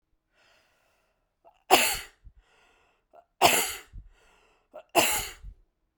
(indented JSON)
{
  "three_cough_length": "6.0 s",
  "three_cough_amplitude": 24786,
  "three_cough_signal_mean_std_ratio": 0.3,
  "survey_phase": "beta (2021-08-13 to 2022-03-07)",
  "age": "65+",
  "gender": "Female",
  "wearing_mask": "No",
  "symptom_none": true,
  "smoker_status": "Never smoked",
  "respiratory_condition_asthma": false,
  "respiratory_condition_other": false,
  "recruitment_source": "REACT",
  "submission_delay": "1 day",
  "covid_test_result": "Negative",
  "covid_test_method": "RT-qPCR"
}